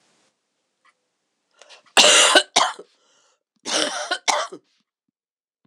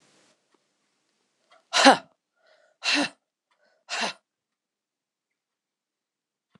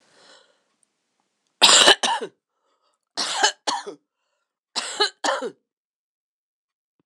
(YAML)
cough_length: 5.7 s
cough_amplitude: 26028
cough_signal_mean_std_ratio: 0.34
exhalation_length: 6.6 s
exhalation_amplitude: 25032
exhalation_signal_mean_std_ratio: 0.21
three_cough_length: 7.1 s
three_cough_amplitude: 26028
three_cough_signal_mean_std_ratio: 0.31
survey_phase: alpha (2021-03-01 to 2021-08-12)
age: 45-64
gender: Female
wearing_mask: 'No'
symptom_cough_any: true
symptom_new_continuous_cough: true
symptom_shortness_of_breath: true
symptom_fatigue: true
symptom_fever_high_temperature: true
symptom_change_to_sense_of_smell_or_taste: true
symptom_loss_of_taste: true
symptom_onset: 3 days
smoker_status: Never smoked
respiratory_condition_asthma: false
respiratory_condition_other: false
recruitment_source: Test and Trace
submission_delay: 2 days
covid_test_result: Positive
covid_test_method: RT-qPCR
covid_ct_value: 18.6
covid_ct_gene: ORF1ab gene